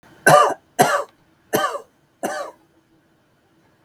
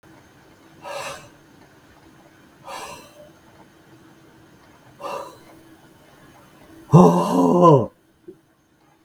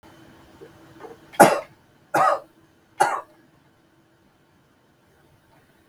{
  "cough_length": "3.8 s",
  "cough_amplitude": 32768,
  "cough_signal_mean_std_ratio": 0.36,
  "exhalation_length": "9.0 s",
  "exhalation_amplitude": 32768,
  "exhalation_signal_mean_std_ratio": 0.29,
  "three_cough_length": "5.9 s",
  "three_cough_amplitude": 32768,
  "three_cough_signal_mean_std_ratio": 0.25,
  "survey_phase": "beta (2021-08-13 to 2022-03-07)",
  "age": "65+",
  "gender": "Male",
  "wearing_mask": "No",
  "symptom_none": true,
  "smoker_status": "Ex-smoker",
  "respiratory_condition_asthma": false,
  "respiratory_condition_other": false,
  "recruitment_source": "REACT",
  "submission_delay": "1 day",
  "covid_test_result": "Negative",
  "covid_test_method": "RT-qPCR",
  "influenza_a_test_result": "Negative",
  "influenza_b_test_result": "Negative"
}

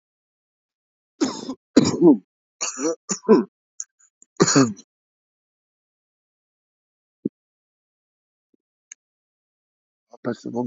{
  "three_cough_length": "10.7 s",
  "three_cough_amplitude": 28325,
  "three_cough_signal_mean_std_ratio": 0.27,
  "survey_phase": "beta (2021-08-13 to 2022-03-07)",
  "age": "18-44",
  "gender": "Male",
  "wearing_mask": "No",
  "symptom_none": true,
  "smoker_status": "Never smoked",
  "respiratory_condition_asthma": true,
  "respiratory_condition_other": false,
  "recruitment_source": "Test and Trace",
  "submission_delay": "-1 day",
  "covid_test_result": "Negative",
  "covid_test_method": "LFT"
}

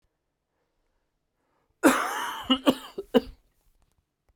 {
  "cough_length": "4.4 s",
  "cough_amplitude": 18366,
  "cough_signal_mean_std_ratio": 0.29,
  "survey_phase": "beta (2021-08-13 to 2022-03-07)",
  "age": "45-64",
  "gender": "Male",
  "wearing_mask": "No",
  "symptom_cough_any": true,
  "symptom_runny_or_blocked_nose": true,
  "symptom_shortness_of_breath": true,
  "symptom_sore_throat": true,
  "symptom_fatigue": true,
  "symptom_fever_high_temperature": true,
  "symptom_headache": true,
  "symptom_change_to_sense_of_smell_or_taste": true,
  "symptom_loss_of_taste": true,
  "smoker_status": "Never smoked",
  "respiratory_condition_asthma": false,
  "respiratory_condition_other": false,
  "recruitment_source": "Test and Trace",
  "submission_delay": "1 day",
  "covid_test_result": "Positive",
  "covid_test_method": "RT-qPCR",
  "covid_ct_value": 28.7,
  "covid_ct_gene": "ORF1ab gene"
}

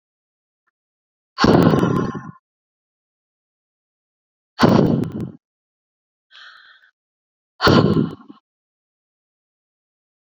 {
  "exhalation_length": "10.3 s",
  "exhalation_amplitude": 28806,
  "exhalation_signal_mean_std_ratio": 0.32,
  "survey_phase": "beta (2021-08-13 to 2022-03-07)",
  "age": "45-64",
  "gender": "Female",
  "wearing_mask": "No",
  "symptom_cough_any": true,
  "symptom_fatigue": true,
  "symptom_change_to_sense_of_smell_or_taste": true,
  "symptom_other": true,
  "symptom_onset": "4 days",
  "smoker_status": "Never smoked",
  "respiratory_condition_asthma": false,
  "respiratory_condition_other": false,
  "recruitment_source": "Test and Trace",
  "submission_delay": "1 day",
  "covid_test_result": "Positive",
  "covid_test_method": "RT-qPCR",
  "covid_ct_value": 18.6,
  "covid_ct_gene": "ORF1ab gene",
  "covid_ct_mean": 19.0,
  "covid_viral_load": "590000 copies/ml",
  "covid_viral_load_category": "Low viral load (10K-1M copies/ml)"
}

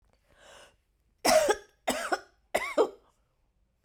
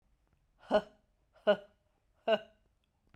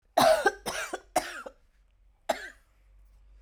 {
  "three_cough_length": "3.8 s",
  "three_cough_amplitude": 9978,
  "three_cough_signal_mean_std_ratio": 0.36,
  "exhalation_length": "3.2 s",
  "exhalation_amplitude": 5355,
  "exhalation_signal_mean_std_ratio": 0.26,
  "cough_length": "3.4 s",
  "cough_amplitude": 12876,
  "cough_signal_mean_std_ratio": 0.37,
  "survey_phase": "beta (2021-08-13 to 2022-03-07)",
  "age": "45-64",
  "gender": "Female",
  "wearing_mask": "No",
  "symptom_cough_any": true,
  "symptom_sore_throat": true,
  "symptom_headache": true,
  "smoker_status": "Ex-smoker",
  "respiratory_condition_asthma": false,
  "respiratory_condition_other": false,
  "recruitment_source": "REACT",
  "submission_delay": "2 days",
  "covid_test_result": "Negative",
  "covid_test_method": "RT-qPCR"
}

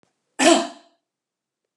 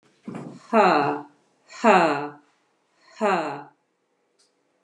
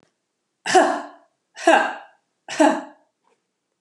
{
  "cough_length": "1.8 s",
  "cough_amplitude": 28400,
  "cough_signal_mean_std_ratio": 0.3,
  "exhalation_length": "4.8 s",
  "exhalation_amplitude": 25388,
  "exhalation_signal_mean_std_ratio": 0.4,
  "three_cough_length": "3.8 s",
  "three_cough_amplitude": 30184,
  "three_cough_signal_mean_std_ratio": 0.36,
  "survey_phase": "beta (2021-08-13 to 2022-03-07)",
  "age": "45-64",
  "gender": "Female",
  "wearing_mask": "No",
  "symptom_cough_any": true,
  "symptom_runny_or_blocked_nose": true,
  "symptom_shortness_of_breath": true,
  "symptom_onset": "4 days",
  "smoker_status": "Ex-smoker",
  "respiratory_condition_asthma": false,
  "respiratory_condition_other": false,
  "recruitment_source": "Test and Trace",
  "submission_delay": "2 days",
  "covid_test_result": "Positive",
  "covid_test_method": "RT-qPCR",
  "covid_ct_value": 22.0,
  "covid_ct_gene": "ORF1ab gene"
}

